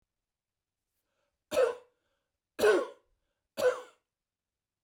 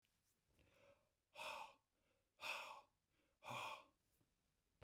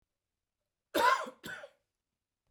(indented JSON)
{
  "three_cough_length": "4.8 s",
  "three_cough_amplitude": 6873,
  "three_cough_signal_mean_std_ratio": 0.3,
  "exhalation_length": "4.8 s",
  "exhalation_amplitude": 535,
  "exhalation_signal_mean_std_ratio": 0.42,
  "cough_length": "2.5 s",
  "cough_amplitude": 5772,
  "cough_signal_mean_std_ratio": 0.3,
  "survey_phase": "beta (2021-08-13 to 2022-03-07)",
  "age": "45-64",
  "gender": "Male",
  "wearing_mask": "No",
  "symptom_none": true,
  "smoker_status": "Never smoked",
  "respiratory_condition_asthma": false,
  "respiratory_condition_other": false,
  "recruitment_source": "REACT",
  "submission_delay": "2 days",
  "covid_test_result": "Negative",
  "covid_test_method": "RT-qPCR",
  "influenza_a_test_result": "Unknown/Void",
  "influenza_b_test_result": "Unknown/Void"
}